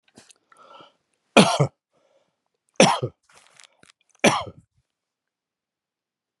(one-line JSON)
{"three_cough_length": "6.4 s", "three_cough_amplitude": 32767, "three_cough_signal_mean_std_ratio": 0.23, "survey_phase": "beta (2021-08-13 to 2022-03-07)", "age": "65+", "gender": "Male", "wearing_mask": "No", "symptom_none": true, "smoker_status": "Ex-smoker", "respiratory_condition_asthma": false, "respiratory_condition_other": false, "recruitment_source": "REACT", "submission_delay": "4 days", "covid_test_result": "Negative", "covid_test_method": "RT-qPCR"}